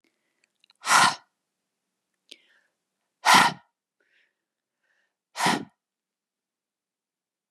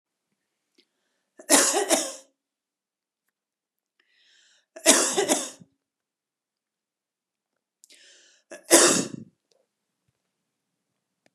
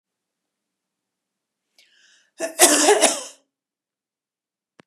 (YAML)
exhalation_length: 7.5 s
exhalation_amplitude: 23429
exhalation_signal_mean_std_ratio: 0.24
three_cough_length: 11.3 s
three_cough_amplitude: 31630
three_cough_signal_mean_std_ratio: 0.27
cough_length: 4.9 s
cough_amplitude: 32767
cough_signal_mean_std_ratio: 0.28
survey_phase: beta (2021-08-13 to 2022-03-07)
age: 45-64
gender: Female
wearing_mask: 'No'
symptom_none: true
smoker_status: Never smoked
respiratory_condition_asthma: false
respiratory_condition_other: false
recruitment_source: REACT
submission_delay: 1 day
covid_test_result: Negative
covid_test_method: RT-qPCR
influenza_a_test_result: Unknown/Void
influenza_b_test_result: Unknown/Void